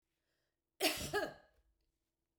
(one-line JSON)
{"cough_length": "2.4 s", "cough_amplitude": 3675, "cough_signal_mean_std_ratio": 0.33, "survey_phase": "beta (2021-08-13 to 2022-03-07)", "age": "65+", "gender": "Female", "wearing_mask": "No", "symptom_none": true, "smoker_status": "Never smoked", "respiratory_condition_asthma": false, "respiratory_condition_other": false, "recruitment_source": "REACT", "submission_delay": "2 days", "covid_test_result": "Negative", "covid_test_method": "RT-qPCR", "influenza_a_test_result": "Negative", "influenza_b_test_result": "Negative"}